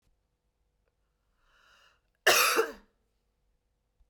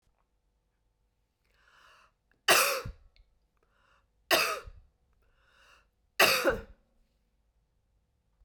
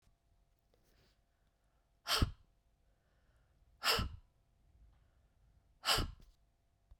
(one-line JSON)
{"cough_length": "4.1 s", "cough_amplitude": 12890, "cough_signal_mean_std_ratio": 0.25, "three_cough_length": "8.4 s", "three_cough_amplitude": 13232, "three_cough_signal_mean_std_ratio": 0.27, "exhalation_length": "7.0 s", "exhalation_amplitude": 4273, "exhalation_signal_mean_std_ratio": 0.27, "survey_phase": "beta (2021-08-13 to 2022-03-07)", "age": "45-64", "gender": "Female", "wearing_mask": "No", "symptom_shortness_of_breath": true, "symptom_sore_throat": true, "symptom_onset": "12 days", "smoker_status": "Never smoked", "respiratory_condition_asthma": false, "respiratory_condition_other": false, "recruitment_source": "REACT", "submission_delay": "1 day", "covid_test_result": "Negative", "covid_test_method": "RT-qPCR"}